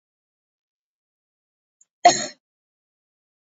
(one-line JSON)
{"cough_length": "3.5 s", "cough_amplitude": 29103, "cough_signal_mean_std_ratio": 0.15, "survey_phase": "beta (2021-08-13 to 2022-03-07)", "age": "18-44", "gender": "Female", "wearing_mask": "No", "symptom_none": true, "smoker_status": "Never smoked", "respiratory_condition_asthma": false, "respiratory_condition_other": false, "recruitment_source": "REACT", "submission_delay": "1 day", "covid_test_result": "Negative", "covid_test_method": "RT-qPCR", "influenza_a_test_result": "Negative", "influenza_b_test_result": "Negative"}